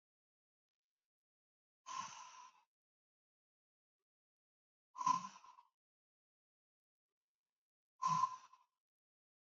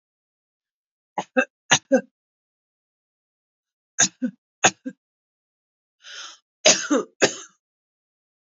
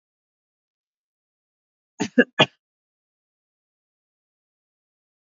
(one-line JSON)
{"exhalation_length": "9.6 s", "exhalation_amplitude": 2098, "exhalation_signal_mean_std_ratio": 0.22, "three_cough_length": "8.5 s", "three_cough_amplitude": 28048, "three_cough_signal_mean_std_ratio": 0.25, "cough_length": "5.2 s", "cough_amplitude": 26596, "cough_signal_mean_std_ratio": 0.13, "survey_phase": "beta (2021-08-13 to 2022-03-07)", "age": "45-64", "gender": "Female", "wearing_mask": "No", "symptom_runny_or_blocked_nose": true, "symptom_diarrhoea": true, "symptom_fatigue": true, "symptom_fever_high_temperature": true, "symptom_headache": true, "symptom_change_to_sense_of_smell_or_taste": true, "symptom_loss_of_taste": true, "symptom_onset": "6 days", "smoker_status": "Current smoker (e-cigarettes or vapes only)", "respiratory_condition_asthma": false, "respiratory_condition_other": false, "recruitment_source": "Test and Trace", "submission_delay": "2 days", "covid_test_result": "Positive", "covid_test_method": "ePCR"}